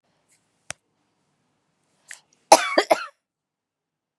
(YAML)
cough_length: 4.2 s
cough_amplitude: 32768
cough_signal_mean_std_ratio: 0.18
survey_phase: beta (2021-08-13 to 2022-03-07)
age: 45-64
gender: Female
wearing_mask: 'No'
symptom_cough_any: true
symptom_new_continuous_cough: true
symptom_runny_or_blocked_nose: true
symptom_sore_throat: true
symptom_headache: true
smoker_status: Never smoked
respiratory_condition_asthma: false
respiratory_condition_other: false
recruitment_source: Test and Trace
submission_delay: 1 day
covid_test_result: Positive
covid_test_method: RT-qPCR
covid_ct_value: 29.5
covid_ct_gene: N gene